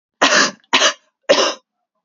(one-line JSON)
{"three_cough_length": "2.0 s", "three_cough_amplitude": 32768, "three_cough_signal_mean_std_ratio": 0.49, "survey_phase": "beta (2021-08-13 to 2022-03-07)", "age": "18-44", "gender": "Female", "wearing_mask": "No", "symptom_cough_any": true, "symptom_new_continuous_cough": true, "symptom_sore_throat": true, "symptom_abdominal_pain": true, "symptom_fatigue": true, "symptom_fever_high_temperature": true, "symptom_headache": true, "symptom_change_to_sense_of_smell_or_taste": true, "symptom_loss_of_taste": true, "symptom_onset": "4 days", "smoker_status": "Current smoker (1 to 10 cigarettes per day)", "respiratory_condition_asthma": false, "respiratory_condition_other": false, "recruitment_source": "Test and Trace", "submission_delay": "2 days", "covid_test_result": "Positive", "covid_test_method": "LAMP"}